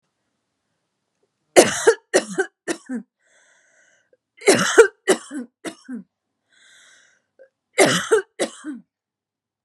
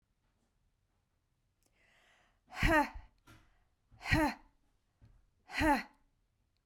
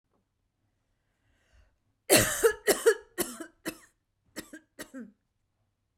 {
  "three_cough_length": "9.6 s",
  "three_cough_amplitude": 32768,
  "three_cough_signal_mean_std_ratio": 0.3,
  "exhalation_length": "6.7 s",
  "exhalation_amplitude": 6569,
  "exhalation_signal_mean_std_ratio": 0.3,
  "cough_length": "6.0 s",
  "cough_amplitude": 17555,
  "cough_signal_mean_std_ratio": 0.28,
  "survey_phase": "beta (2021-08-13 to 2022-03-07)",
  "age": "45-64",
  "gender": "Female",
  "wearing_mask": "No",
  "symptom_abdominal_pain": true,
  "symptom_fatigue": true,
  "smoker_status": "Never smoked",
  "respiratory_condition_asthma": false,
  "respiratory_condition_other": false,
  "recruitment_source": "REACT",
  "submission_delay": "1 day",
  "covid_test_result": "Negative",
  "covid_test_method": "RT-qPCR"
}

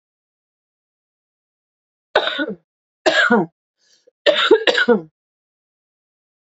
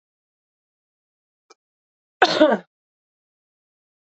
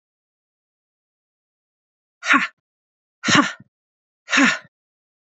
{
  "three_cough_length": "6.5 s",
  "three_cough_amplitude": 29593,
  "three_cough_signal_mean_std_ratio": 0.35,
  "cough_length": "4.2 s",
  "cough_amplitude": 27739,
  "cough_signal_mean_std_ratio": 0.2,
  "exhalation_length": "5.2 s",
  "exhalation_amplitude": 27578,
  "exhalation_signal_mean_std_ratio": 0.28,
  "survey_phase": "beta (2021-08-13 to 2022-03-07)",
  "age": "18-44",
  "gender": "Female",
  "wearing_mask": "No",
  "symptom_cough_any": true,
  "symptom_shortness_of_breath": true,
  "symptom_fatigue": true,
  "symptom_fever_high_temperature": true,
  "symptom_headache": true,
  "symptom_onset": "3 days",
  "smoker_status": "Ex-smoker",
  "respiratory_condition_asthma": false,
  "respiratory_condition_other": false,
  "recruitment_source": "Test and Trace",
  "submission_delay": "1 day",
  "covid_test_result": "Positive",
  "covid_test_method": "RT-qPCR"
}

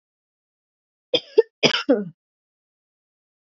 {
  "cough_length": "3.5 s",
  "cough_amplitude": 28846,
  "cough_signal_mean_std_ratio": 0.24,
  "survey_phase": "beta (2021-08-13 to 2022-03-07)",
  "age": "45-64",
  "gender": "Female",
  "wearing_mask": "No",
  "symptom_cough_any": true,
  "symptom_runny_or_blocked_nose": true,
  "symptom_shortness_of_breath": true,
  "symptom_sore_throat": true,
  "symptom_fatigue": true,
  "symptom_fever_high_temperature": true,
  "symptom_headache": true,
  "symptom_change_to_sense_of_smell_or_taste": true,
  "symptom_onset": "3 days",
  "smoker_status": "Never smoked",
  "respiratory_condition_asthma": false,
  "respiratory_condition_other": false,
  "recruitment_source": "Test and Trace",
  "submission_delay": "1 day",
  "covid_test_result": "Positive",
  "covid_test_method": "RT-qPCR",
  "covid_ct_value": 15.1,
  "covid_ct_gene": "ORF1ab gene",
  "covid_ct_mean": 15.3,
  "covid_viral_load": "9800000 copies/ml",
  "covid_viral_load_category": "High viral load (>1M copies/ml)"
}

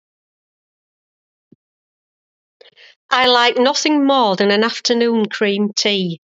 {
  "exhalation_length": "6.4 s",
  "exhalation_amplitude": 32768,
  "exhalation_signal_mean_std_ratio": 0.56,
  "survey_phase": "beta (2021-08-13 to 2022-03-07)",
  "age": "45-64",
  "gender": "Female",
  "wearing_mask": "No",
  "symptom_none": true,
  "smoker_status": "Never smoked",
  "respiratory_condition_asthma": true,
  "respiratory_condition_other": false,
  "recruitment_source": "REACT",
  "submission_delay": "1 day",
  "covid_test_result": "Negative",
  "covid_test_method": "RT-qPCR"
}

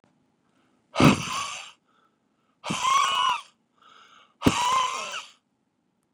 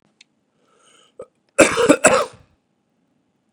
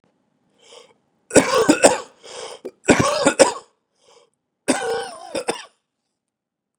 {
  "exhalation_length": "6.1 s",
  "exhalation_amplitude": 25175,
  "exhalation_signal_mean_std_ratio": 0.41,
  "cough_length": "3.5 s",
  "cough_amplitude": 32768,
  "cough_signal_mean_std_ratio": 0.29,
  "three_cough_length": "6.8 s",
  "three_cough_amplitude": 32768,
  "three_cough_signal_mean_std_ratio": 0.35,
  "survey_phase": "beta (2021-08-13 to 2022-03-07)",
  "age": "18-44",
  "gender": "Male",
  "wearing_mask": "No",
  "symptom_none": true,
  "smoker_status": "Current smoker (e-cigarettes or vapes only)",
  "respiratory_condition_asthma": false,
  "respiratory_condition_other": false,
  "recruitment_source": "REACT",
  "submission_delay": "2 days",
  "covid_test_result": "Negative",
  "covid_test_method": "RT-qPCR",
  "influenza_a_test_result": "Negative",
  "influenza_b_test_result": "Negative"
}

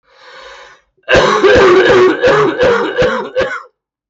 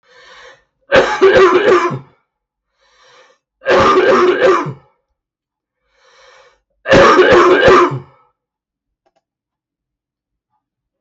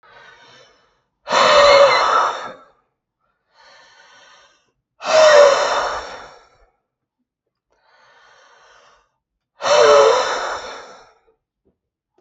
{
  "cough_length": "4.1 s",
  "cough_amplitude": 32768,
  "cough_signal_mean_std_ratio": 0.76,
  "three_cough_length": "11.0 s",
  "three_cough_amplitude": 32768,
  "three_cough_signal_mean_std_ratio": 0.48,
  "exhalation_length": "12.2 s",
  "exhalation_amplitude": 32766,
  "exhalation_signal_mean_std_ratio": 0.41,
  "survey_phase": "beta (2021-08-13 to 2022-03-07)",
  "age": "18-44",
  "gender": "Male",
  "wearing_mask": "No",
  "symptom_cough_any": true,
  "symptom_runny_or_blocked_nose": true,
  "symptom_shortness_of_breath": true,
  "symptom_sore_throat": true,
  "symptom_diarrhoea": true,
  "symptom_headache": true,
  "symptom_loss_of_taste": true,
  "smoker_status": "Ex-smoker",
  "respiratory_condition_asthma": false,
  "respiratory_condition_other": false,
  "recruitment_source": "Test and Trace",
  "submission_delay": "2 days",
  "covid_test_result": "Positive",
  "covid_test_method": "RT-qPCR",
  "covid_ct_value": 15.8,
  "covid_ct_gene": "N gene",
  "covid_ct_mean": 16.1,
  "covid_viral_load": "5200000 copies/ml",
  "covid_viral_load_category": "High viral load (>1M copies/ml)"
}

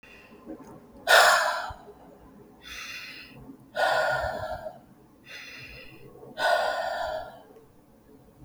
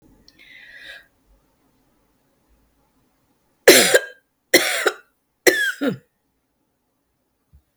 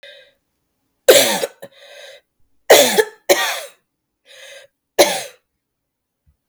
{
  "exhalation_length": "8.4 s",
  "exhalation_amplitude": 17596,
  "exhalation_signal_mean_std_ratio": 0.46,
  "cough_length": "7.8 s",
  "cough_amplitude": 32768,
  "cough_signal_mean_std_ratio": 0.26,
  "three_cough_length": "6.5 s",
  "three_cough_amplitude": 32768,
  "three_cough_signal_mean_std_ratio": 0.32,
  "survey_phase": "beta (2021-08-13 to 2022-03-07)",
  "age": "65+",
  "gender": "Female",
  "wearing_mask": "No",
  "symptom_cough_any": true,
  "symptom_runny_or_blocked_nose": true,
  "symptom_onset": "12 days",
  "smoker_status": "Ex-smoker",
  "respiratory_condition_asthma": true,
  "respiratory_condition_other": false,
  "recruitment_source": "REACT",
  "submission_delay": "1 day",
  "covid_test_result": "Negative",
  "covid_test_method": "RT-qPCR",
  "influenza_a_test_result": "Negative",
  "influenza_b_test_result": "Negative"
}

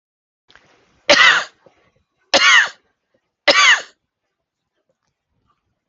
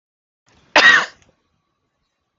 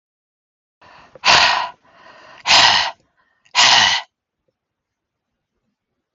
{
  "three_cough_length": "5.9 s",
  "three_cough_amplitude": 32768,
  "three_cough_signal_mean_std_ratio": 0.33,
  "cough_length": "2.4 s",
  "cough_amplitude": 32768,
  "cough_signal_mean_std_ratio": 0.28,
  "exhalation_length": "6.1 s",
  "exhalation_amplitude": 32768,
  "exhalation_signal_mean_std_ratio": 0.37,
  "survey_phase": "beta (2021-08-13 to 2022-03-07)",
  "age": "45-64",
  "gender": "Female",
  "wearing_mask": "No",
  "symptom_none": true,
  "smoker_status": "Ex-smoker",
  "respiratory_condition_asthma": false,
  "respiratory_condition_other": false,
  "recruitment_source": "REACT",
  "submission_delay": "2 days",
  "covid_test_result": "Negative",
  "covid_test_method": "RT-qPCR",
  "influenza_a_test_result": "Negative",
  "influenza_b_test_result": "Negative"
}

